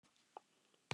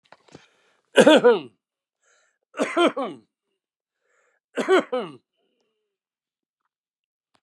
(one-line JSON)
{"cough_length": "0.9 s", "cough_amplitude": 2012, "cough_signal_mean_std_ratio": 0.2, "three_cough_length": "7.4 s", "three_cough_amplitude": 31988, "three_cough_signal_mean_std_ratio": 0.28, "survey_phase": "beta (2021-08-13 to 2022-03-07)", "age": "65+", "gender": "Male", "wearing_mask": "No", "symptom_runny_or_blocked_nose": true, "smoker_status": "Ex-smoker", "respiratory_condition_asthma": false, "respiratory_condition_other": false, "recruitment_source": "REACT", "submission_delay": "1 day", "covid_test_result": "Negative", "covid_test_method": "RT-qPCR", "influenza_a_test_result": "Unknown/Void", "influenza_b_test_result": "Unknown/Void"}